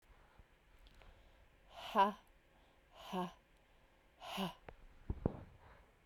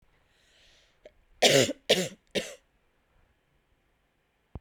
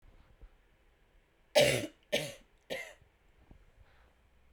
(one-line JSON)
{"exhalation_length": "6.1 s", "exhalation_amplitude": 5639, "exhalation_signal_mean_std_ratio": 0.32, "cough_length": "4.6 s", "cough_amplitude": 16629, "cough_signal_mean_std_ratio": 0.27, "three_cough_length": "4.5 s", "three_cough_amplitude": 8863, "three_cough_signal_mean_std_ratio": 0.28, "survey_phase": "beta (2021-08-13 to 2022-03-07)", "age": "18-44", "gender": "Female", "wearing_mask": "No", "symptom_cough_any": true, "symptom_runny_or_blocked_nose": true, "symptom_sore_throat": true, "symptom_fatigue": true, "symptom_headache": true, "symptom_change_to_sense_of_smell_or_taste": true, "symptom_loss_of_taste": true, "symptom_onset": "4 days", "smoker_status": "Never smoked", "respiratory_condition_asthma": true, "respiratory_condition_other": false, "recruitment_source": "Test and Trace", "submission_delay": "1 day", "covid_test_result": "Positive", "covid_test_method": "RT-qPCR", "covid_ct_value": 18.4, "covid_ct_gene": "ORF1ab gene"}